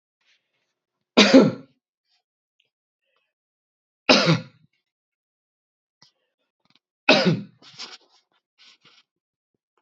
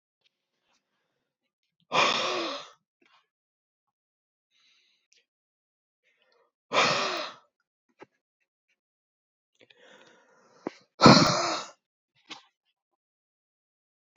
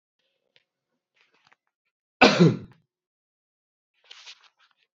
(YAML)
three_cough_length: 9.8 s
three_cough_amplitude: 31146
three_cough_signal_mean_std_ratio: 0.23
exhalation_length: 14.2 s
exhalation_amplitude: 27234
exhalation_signal_mean_std_ratio: 0.23
cough_length: 4.9 s
cough_amplitude: 28579
cough_signal_mean_std_ratio: 0.2
survey_phase: beta (2021-08-13 to 2022-03-07)
age: 45-64
wearing_mask: 'No'
symptom_runny_or_blocked_nose: true
symptom_fatigue: true
symptom_headache: true
symptom_onset: 2 days
smoker_status: Ex-smoker
respiratory_condition_asthma: true
respiratory_condition_other: false
recruitment_source: Test and Trace
submission_delay: 2 days
covid_test_result: Positive
covid_test_method: RT-qPCR
covid_ct_value: 19.5
covid_ct_gene: ORF1ab gene
covid_ct_mean: 20.1
covid_viral_load: 260000 copies/ml
covid_viral_load_category: Low viral load (10K-1M copies/ml)